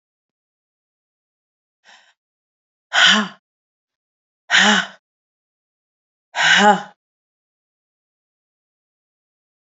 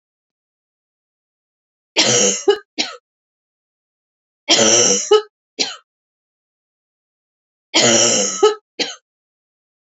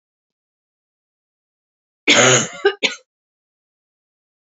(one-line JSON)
{"exhalation_length": "9.7 s", "exhalation_amplitude": 31939, "exhalation_signal_mean_std_ratio": 0.26, "three_cough_length": "9.9 s", "three_cough_amplitude": 32767, "three_cough_signal_mean_std_ratio": 0.38, "cough_length": "4.5 s", "cough_amplitude": 30267, "cough_signal_mean_std_ratio": 0.28, "survey_phase": "beta (2021-08-13 to 2022-03-07)", "age": "45-64", "gender": "Female", "wearing_mask": "No", "symptom_new_continuous_cough": true, "symptom_fatigue": true, "symptom_onset": "3 days", "smoker_status": "Never smoked", "respiratory_condition_asthma": false, "respiratory_condition_other": false, "recruitment_source": "Test and Trace", "submission_delay": "2 days", "covid_test_result": "Positive", "covid_test_method": "RT-qPCR", "covid_ct_value": 28.1, "covid_ct_gene": "ORF1ab gene", "covid_ct_mean": 28.4, "covid_viral_load": "490 copies/ml", "covid_viral_load_category": "Minimal viral load (< 10K copies/ml)"}